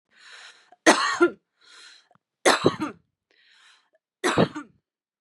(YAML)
three_cough_length: 5.2 s
three_cough_amplitude: 27727
three_cough_signal_mean_std_ratio: 0.32
survey_phase: beta (2021-08-13 to 2022-03-07)
age: 18-44
gender: Female
wearing_mask: 'No'
symptom_none: true
smoker_status: Ex-smoker
respiratory_condition_asthma: false
respiratory_condition_other: false
recruitment_source: REACT
submission_delay: 6 days
covid_test_result: Negative
covid_test_method: RT-qPCR
influenza_a_test_result: Negative
influenza_b_test_result: Negative